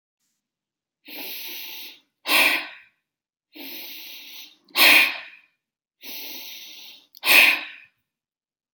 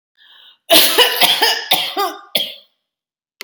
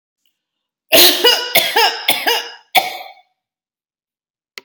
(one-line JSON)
{"exhalation_length": "8.7 s", "exhalation_amplitude": 28518, "exhalation_signal_mean_std_ratio": 0.34, "cough_length": "3.4 s", "cough_amplitude": 32768, "cough_signal_mean_std_ratio": 0.51, "three_cough_length": "4.6 s", "three_cough_amplitude": 32768, "three_cough_signal_mean_std_ratio": 0.43, "survey_phase": "beta (2021-08-13 to 2022-03-07)", "age": "45-64", "gender": "Female", "wearing_mask": "No", "symptom_none": true, "smoker_status": "Never smoked", "respiratory_condition_asthma": false, "respiratory_condition_other": false, "recruitment_source": "REACT", "submission_delay": "1 day", "covid_test_result": "Negative", "covid_test_method": "RT-qPCR"}